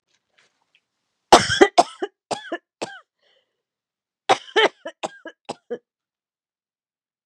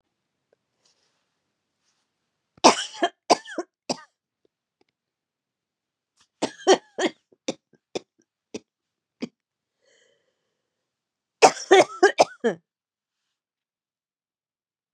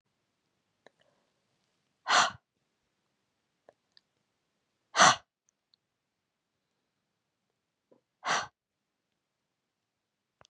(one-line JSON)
{"cough_length": "7.3 s", "cough_amplitude": 32768, "cough_signal_mean_std_ratio": 0.23, "three_cough_length": "14.9 s", "three_cough_amplitude": 31989, "three_cough_signal_mean_std_ratio": 0.2, "exhalation_length": "10.5 s", "exhalation_amplitude": 17097, "exhalation_signal_mean_std_ratio": 0.17, "survey_phase": "beta (2021-08-13 to 2022-03-07)", "age": "45-64", "gender": "Female", "wearing_mask": "No", "symptom_cough_any": true, "symptom_new_continuous_cough": true, "symptom_runny_or_blocked_nose": true, "symptom_fatigue": true, "symptom_fever_high_temperature": true, "symptom_headache": true, "symptom_change_to_sense_of_smell_or_taste": true, "symptom_loss_of_taste": true, "symptom_onset": "7 days", "smoker_status": "Ex-smoker", "respiratory_condition_asthma": false, "respiratory_condition_other": false, "recruitment_source": "Test and Trace", "submission_delay": "1 day", "covid_test_result": "Negative", "covid_test_method": "RT-qPCR"}